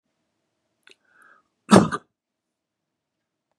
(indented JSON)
{
  "cough_length": "3.6 s",
  "cough_amplitude": 32768,
  "cough_signal_mean_std_ratio": 0.16,
  "survey_phase": "beta (2021-08-13 to 2022-03-07)",
  "age": "65+",
  "gender": "Male",
  "wearing_mask": "No",
  "symptom_none": true,
  "smoker_status": "Never smoked",
  "respiratory_condition_asthma": false,
  "respiratory_condition_other": false,
  "recruitment_source": "REACT",
  "submission_delay": "1 day",
  "covid_test_result": "Negative",
  "covid_test_method": "RT-qPCR",
  "influenza_a_test_result": "Negative",
  "influenza_b_test_result": "Negative"
}